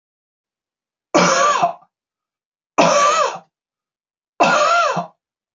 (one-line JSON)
{"three_cough_length": "5.5 s", "three_cough_amplitude": 27243, "three_cough_signal_mean_std_ratio": 0.49, "survey_phase": "beta (2021-08-13 to 2022-03-07)", "age": "45-64", "gender": "Male", "wearing_mask": "No", "symptom_none": true, "smoker_status": "Never smoked", "respiratory_condition_asthma": false, "respiratory_condition_other": false, "recruitment_source": "Test and Trace", "submission_delay": "1 day", "covid_test_result": "Negative", "covid_test_method": "RT-qPCR"}